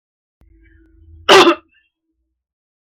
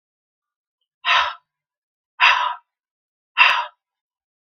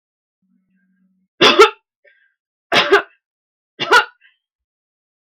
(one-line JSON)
{"cough_length": "2.8 s", "cough_amplitude": 32768, "cough_signal_mean_std_ratio": 0.27, "exhalation_length": "4.4 s", "exhalation_amplitude": 32554, "exhalation_signal_mean_std_ratio": 0.33, "three_cough_length": "5.2 s", "three_cough_amplitude": 32768, "three_cough_signal_mean_std_ratio": 0.29, "survey_phase": "beta (2021-08-13 to 2022-03-07)", "age": "18-44", "gender": "Female", "wearing_mask": "No", "symptom_runny_or_blocked_nose": true, "smoker_status": "Never smoked", "respiratory_condition_asthma": false, "respiratory_condition_other": false, "recruitment_source": "REACT", "submission_delay": "1 day", "covid_test_result": "Negative", "covid_test_method": "RT-qPCR"}